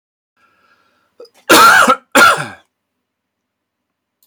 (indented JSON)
{
  "cough_length": "4.3 s",
  "cough_amplitude": 32768,
  "cough_signal_mean_std_ratio": 0.36,
  "survey_phase": "beta (2021-08-13 to 2022-03-07)",
  "age": "45-64",
  "gender": "Male",
  "wearing_mask": "No",
  "symptom_none": true,
  "smoker_status": "Never smoked",
  "respiratory_condition_asthma": false,
  "respiratory_condition_other": false,
  "recruitment_source": "Test and Trace",
  "submission_delay": "0 days",
  "covid_test_result": "Negative",
  "covid_test_method": "LFT"
}